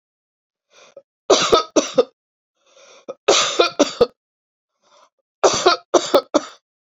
{
  "three_cough_length": "7.0 s",
  "three_cough_amplitude": 30770,
  "three_cough_signal_mean_std_ratio": 0.37,
  "survey_phase": "beta (2021-08-13 to 2022-03-07)",
  "age": "45-64",
  "gender": "Female",
  "wearing_mask": "No",
  "symptom_none": true,
  "smoker_status": "Never smoked",
  "respiratory_condition_asthma": false,
  "respiratory_condition_other": false,
  "recruitment_source": "REACT",
  "submission_delay": "2 days",
  "covid_test_result": "Negative",
  "covid_test_method": "RT-qPCR"
}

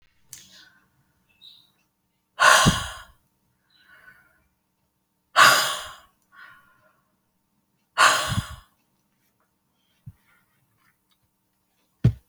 {
  "exhalation_length": "12.3 s",
  "exhalation_amplitude": 27262,
  "exhalation_signal_mean_std_ratio": 0.26,
  "survey_phase": "beta (2021-08-13 to 2022-03-07)",
  "age": "45-64",
  "gender": "Female",
  "wearing_mask": "No",
  "symptom_none": true,
  "smoker_status": "Ex-smoker",
  "respiratory_condition_asthma": false,
  "respiratory_condition_other": false,
  "recruitment_source": "REACT",
  "submission_delay": "1 day",
  "covid_test_result": "Negative",
  "covid_test_method": "RT-qPCR"
}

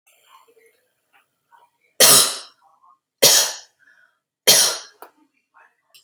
{
  "three_cough_length": "6.0 s",
  "three_cough_amplitude": 32768,
  "three_cough_signal_mean_std_ratio": 0.3,
  "survey_phase": "beta (2021-08-13 to 2022-03-07)",
  "age": "18-44",
  "gender": "Female",
  "wearing_mask": "No",
  "symptom_none": true,
  "smoker_status": "Never smoked",
  "respiratory_condition_asthma": false,
  "respiratory_condition_other": false,
  "recruitment_source": "REACT",
  "submission_delay": "13 days",
  "covid_test_result": "Negative",
  "covid_test_method": "RT-qPCR",
  "influenza_a_test_result": "Negative",
  "influenza_b_test_result": "Negative"
}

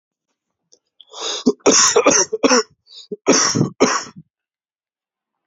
{
  "cough_length": "5.5 s",
  "cough_amplitude": 30300,
  "cough_signal_mean_std_ratio": 0.45,
  "survey_phase": "beta (2021-08-13 to 2022-03-07)",
  "age": "18-44",
  "gender": "Male",
  "wearing_mask": "No",
  "symptom_cough_any": true,
  "symptom_runny_or_blocked_nose": true,
  "symptom_shortness_of_breath": true,
  "symptom_sore_throat": true,
  "symptom_fatigue": true,
  "symptom_fever_high_temperature": true,
  "symptom_onset": "2 days",
  "smoker_status": "Ex-smoker",
  "respiratory_condition_asthma": true,
  "respiratory_condition_other": false,
  "recruitment_source": "Test and Trace",
  "submission_delay": "1 day",
  "covid_test_result": "Positive",
  "covid_test_method": "RT-qPCR",
  "covid_ct_value": 23.6,
  "covid_ct_gene": "ORF1ab gene"
}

